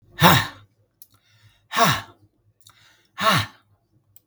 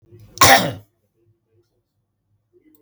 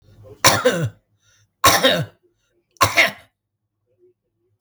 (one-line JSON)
{"exhalation_length": "4.3 s", "exhalation_amplitude": 32768, "exhalation_signal_mean_std_ratio": 0.33, "cough_length": "2.8 s", "cough_amplitude": 32768, "cough_signal_mean_std_ratio": 0.25, "three_cough_length": "4.6 s", "three_cough_amplitude": 32768, "three_cough_signal_mean_std_ratio": 0.37, "survey_phase": "beta (2021-08-13 to 2022-03-07)", "age": "65+", "gender": "Male", "wearing_mask": "No", "symptom_none": true, "smoker_status": "Never smoked", "respiratory_condition_asthma": false, "respiratory_condition_other": false, "recruitment_source": "REACT", "submission_delay": "3 days", "covid_test_result": "Negative", "covid_test_method": "RT-qPCR", "influenza_a_test_result": "Negative", "influenza_b_test_result": "Negative"}